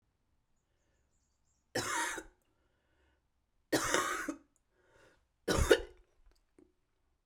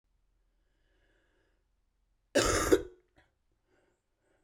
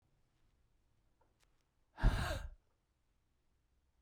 {"three_cough_length": "7.3 s", "three_cough_amplitude": 10929, "three_cough_signal_mean_std_ratio": 0.31, "cough_length": "4.4 s", "cough_amplitude": 9920, "cough_signal_mean_std_ratio": 0.25, "exhalation_length": "4.0 s", "exhalation_amplitude": 4167, "exhalation_signal_mean_std_ratio": 0.24, "survey_phase": "beta (2021-08-13 to 2022-03-07)", "age": "45-64", "gender": "Female", "wearing_mask": "No", "symptom_cough_any": true, "symptom_runny_or_blocked_nose": true, "symptom_shortness_of_breath": true, "symptom_sore_throat": true, "symptom_abdominal_pain": true, "symptom_diarrhoea": true, "symptom_fatigue": true, "symptom_fever_high_temperature": true, "symptom_change_to_sense_of_smell_or_taste": true, "symptom_loss_of_taste": true, "symptom_onset": "4 days", "smoker_status": "Never smoked", "respiratory_condition_asthma": false, "respiratory_condition_other": false, "recruitment_source": "Test and Trace", "submission_delay": "3 days", "covid_test_result": "Positive", "covid_test_method": "RT-qPCR", "covid_ct_value": 20.9, "covid_ct_gene": "N gene"}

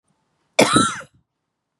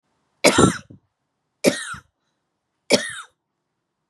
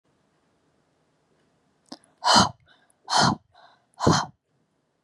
{"cough_length": "1.8 s", "cough_amplitude": 32768, "cough_signal_mean_std_ratio": 0.34, "three_cough_length": "4.1 s", "three_cough_amplitude": 32767, "three_cough_signal_mean_std_ratio": 0.29, "exhalation_length": "5.0 s", "exhalation_amplitude": 22737, "exhalation_signal_mean_std_ratio": 0.3, "survey_phase": "beta (2021-08-13 to 2022-03-07)", "age": "18-44", "gender": "Female", "wearing_mask": "No", "symptom_none": true, "smoker_status": "Never smoked", "respiratory_condition_asthma": false, "respiratory_condition_other": false, "recruitment_source": "Test and Trace", "submission_delay": "4 days", "covid_test_result": "Positive", "covid_test_method": "RT-qPCR", "covid_ct_value": 30.4, "covid_ct_gene": "ORF1ab gene"}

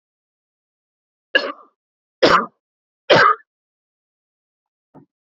{"three_cough_length": "5.2 s", "three_cough_amplitude": 32767, "three_cough_signal_mean_std_ratio": 0.26, "survey_phase": "beta (2021-08-13 to 2022-03-07)", "age": "18-44", "gender": "Male", "wearing_mask": "No", "symptom_none": true, "smoker_status": "Never smoked", "respiratory_condition_asthma": false, "respiratory_condition_other": false, "recruitment_source": "REACT", "submission_delay": "3 days", "covid_test_result": "Negative", "covid_test_method": "RT-qPCR"}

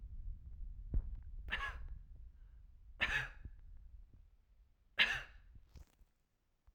{"three_cough_length": "6.7 s", "three_cough_amplitude": 4746, "three_cough_signal_mean_std_ratio": 0.49, "survey_phase": "alpha (2021-03-01 to 2021-08-12)", "age": "45-64", "gender": "Female", "wearing_mask": "No", "symptom_none": true, "smoker_status": "Ex-smoker", "respiratory_condition_asthma": false, "respiratory_condition_other": false, "recruitment_source": "REACT", "submission_delay": "1 day", "covid_test_result": "Negative", "covid_test_method": "RT-qPCR"}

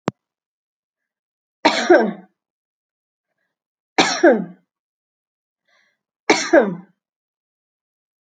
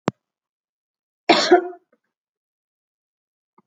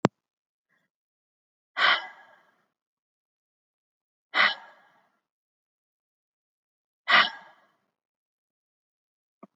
{"three_cough_length": "8.4 s", "three_cough_amplitude": 29845, "three_cough_signal_mean_std_ratio": 0.28, "cough_length": "3.7 s", "cough_amplitude": 28167, "cough_signal_mean_std_ratio": 0.23, "exhalation_length": "9.6 s", "exhalation_amplitude": 25882, "exhalation_signal_mean_std_ratio": 0.2, "survey_phase": "beta (2021-08-13 to 2022-03-07)", "age": "45-64", "gender": "Female", "wearing_mask": "No", "symptom_runny_or_blocked_nose": true, "symptom_other": true, "symptom_onset": "2 days", "smoker_status": "Never smoked", "respiratory_condition_asthma": false, "respiratory_condition_other": false, "recruitment_source": "Test and Trace", "submission_delay": "1 day", "covid_test_result": "Negative", "covid_test_method": "RT-qPCR"}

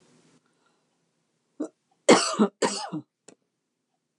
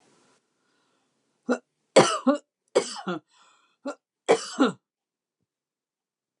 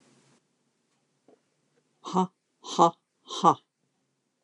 {"cough_length": "4.2 s", "cough_amplitude": 25225, "cough_signal_mean_std_ratio": 0.27, "three_cough_length": "6.4 s", "three_cough_amplitude": 21722, "three_cough_signal_mean_std_ratio": 0.27, "exhalation_length": "4.4 s", "exhalation_amplitude": 17348, "exhalation_signal_mean_std_ratio": 0.24, "survey_phase": "beta (2021-08-13 to 2022-03-07)", "age": "65+", "gender": "Female", "wearing_mask": "No", "symptom_none": true, "symptom_onset": "12 days", "smoker_status": "Ex-smoker", "respiratory_condition_asthma": false, "respiratory_condition_other": false, "recruitment_source": "REACT", "submission_delay": "2 days", "covid_test_result": "Negative", "covid_test_method": "RT-qPCR"}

